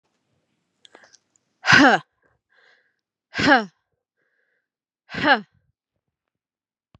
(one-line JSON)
{"exhalation_length": "7.0 s", "exhalation_amplitude": 29642, "exhalation_signal_mean_std_ratio": 0.25, "survey_phase": "beta (2021-08-13 to 2022-03-07)", "age": "45-64", "gender": "Female", "wearing_mask": "No", "symptom_none": true, "symptom_onset": "5 days", "smoker_status": "Ex-smoker", "respiratory_condition_asthma": false, "respiratory_condition_other": false, "recruitment_source": "REACT", "submission_delay": "1 day", "covid_test_result": "Negative", "covid_test_method": "RT-qPCR", "influenza_a_test_result": "Negative", "influenza_b_test_result": "Negative"}